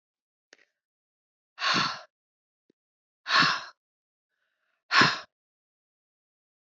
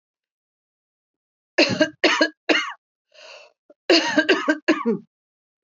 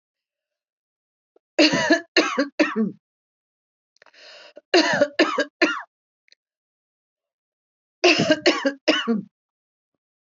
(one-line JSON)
{"exhalation_length": "6.7 s", "exhalation_amplitude": 15603, "exhalation_signal_mean_std_ratio": 0.28, "cough_length": "5.6 s", "cough_amplitude": 22663, "cough_signal_mean_std_ratio": 0.4, "three_cough_length": "10.2 s", "three_cough_amplitude": 25182, "three_cough_signal_mean_std_ratio": 0.38, "survey_phase": "beta (2021-08-13 to 2022-03-07)", "age": "65+", "gender": "Female", "wearing_mask": "No", "symptom_none": true, "smoker_status": "Ex-smoker", "respiratory_condition_asthma": false, "respiratory_condition_other": false, "recruitment_source": "REACT", "submission_delay": "1 day", "covid_test_result": "Negative", "covid_test_method": "RT-qPCR", "influenza_a_test_result": "Negative", "influenza_b_test_result": "Negative"}